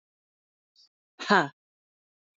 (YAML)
exhalation_length: 2.4 s
exhalation_amplitude: 16473
exhalation_signal_mean_std_ratio: 0.19
survey_phase: beta (2021-08-13 to 2022-03-07)
age: 45-64
gender: Female
wearing_mask: 'No'
symptom_new_continuous_cough: true
symptom_shortness_of_breath: true
symptom_sore_throat: true
symptom_fatigue: true
symptom_fever_high_temperature: true
symptom_headache: true
symptom_onset: 4 days
smoker_status: Ex-smoker
respiratory_condition_asthma: false
respiratory_condition_other: true
recruitment_source: Test and Trace
submission_delay: 2 days
covid_test_result: Positive
covid_test_method: RT-qPCR
covid_ct_value: 21.0
covid_ct_gene: N gene